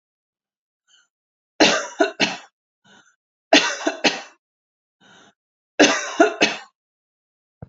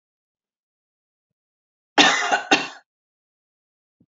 {"three_cough_length": "7.7 s", "three_cough_amplitude": 30508, "three_cough_signal_mean_std_ratio": 0.32, "cough_length": "4.1 s", "cough_amplitude": 29987, "cough_signal_mean_std_ratio": 0.27, "survey_phase": "beta (2021-08-13 to 2022-03-07)", "age": "45-64", "gender": "Female", "wearing_mask": "No", "symptom_none": true, "smoker_status": "Ex-smoker", "respiratory_condition_asthma": true, "respiratory_condition_other": false, "recruitment_source": "REACT", "submission_delay": "2 days", "covid_test_result": "Negative", "covid_test_method": "RT-qPCR", "influenza_a_test_result": "Unknown/Void", "influenza_b_test_result": "Unknown/Void"}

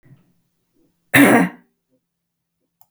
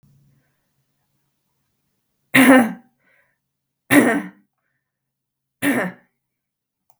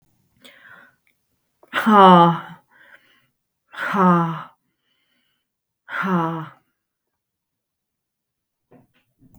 {"cough_length": "2.9 s", "cough_amplitude": 32768, "cough_signal_mean_std_ratio": 0.28, "three_cough_length": "7.0 s", "three_cough_amplitude": 32768, "three_cough_signal_mean_std_ratio": 0.28, "exhalation_length": "9.4 s", "exhalation_amplitude": 32545, "exhalation_signal_mean_std_ratio": 0.31, "survey_phase": "beta (2021-08-13 to 2022-03-07)", "age": "45-64", "gender": "Female", "wearing_mask": "No", "symptom_none": true, "smoker_status": "Never smoked", "respiratory_condition_asthma": false, "respiratory_condition_other": false, "recruitment_source": "REACT", "submission_delay": "1 day", "covid_test_result": "Negative", "covid_test_method": "RT-qPCR", "influenza_a_test_result": "Negative", "influenza_b_test_result": "Negative"}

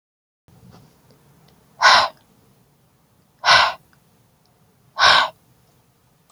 {"exhalation_length": "6.3 s", "exhalation_amplitude": 31806, "exhalation_signal_mean_std_ratio": 0.3, "survey_phase": "alpha (2021-03-01 to 2021-08-12)", "age": "45-64", "gender": "Female", "wearing_mask": "No", "symptom_none": true, "smoker_status": "Never smoked", "respiratory_condition_asthma": false, "respiratory_condition_other": false, "recruitment_source": "REACT", "submission_delay": "2 days", "covid_test_result": "Negative", "covid_test_method": "RT-qPCR"}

